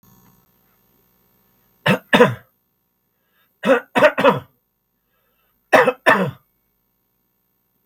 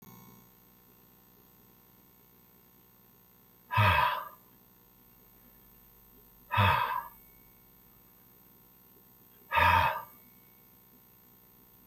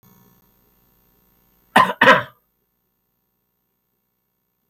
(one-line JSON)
{"three_cough_length": "7.9 s", "three_cough_amplitude": 32766, "three_cough_signal_mean_std_ratio": 0.3, "exhalation_length": "11.9 s", "exhalation_amplitude": 9213, "exhalation_signal_mean_std_ratio": 0.32, "cough_length": "4.7 s", "cough_amplitude": 32768, "cough_signal_mean_std_ratio": 0.21, "survey_phase": "beta (2021-08-13 to 2022-03-07)", "age": "65+", "gender": "Male", "wearing_mask": "No", "symptom_none": true, "smoker_status": "Never smoked", "respiratory_condition_asthma": false, "respiratory_condition_other": false, "recruitment_source": "REACT", "submission_delay": "2 days", "covid_test_result": "Negative", "covid_test_method": "RT-qPCR", "influenza_a_test_result": "Unknown/Void", "influenza_b_test_result": "Unknown/Void"}